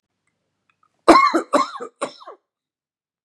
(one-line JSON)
{"cough_length": "3.2 s", "cough_amplitude": 32768, "cough_signal_mean_std_ratio": 0.3, "survey_phase": "beta (2021-08-13 to 2022-03-07)", "age": "45-64", "gender": "Male", "wearing_mask": "No", "symptom_none": true, "smoker_status": "Ex-smoker", "respiratory_condition_asthma": false, "respiratory_condition_other": true, "recruitment_source": "REACT", "submission_delay": "2 days", "covid_test_result": "Negative", "covid_test_method": "RT-qPCR", "influenza_a_test_result": "Negative", "influenza_b_test_result": "Negative"}